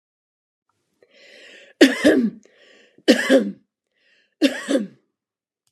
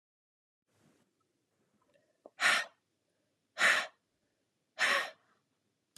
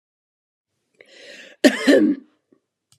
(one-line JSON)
{"three_cough_length": "5.7 s", "three_cough_amplitude": 32767, "three_cough_signal_mean_std_ratio": 0.34, "exhalation_length": "6.0 s", "exhalation_amplitude": 5804, "exhalation_signal_mean_std_ratio": 0.29, "cough_length": "3.0 s", "cough_amplitude": 31698, "cough_signal_mean_std_ratio": 0.31, "survey_phase": "beta (2021-08-13 to 2022-03-07)", "age": "45-64", "gender": "Female", "wearing_mask": "No", "symptom_fatigue": true, "smoker_status": "Never smoked", "respiratory_condition_asthma": true, "respiratory_condition_other": false, "recruitment_source": "REACT", "submission_delay": "1 day", "covid_test_result": "Negative", "covid_test_method": "RT-qPCR", "influenza_a_test_result": "Unknown/Void", "influenza_b_test_result": "Unknown/Void"}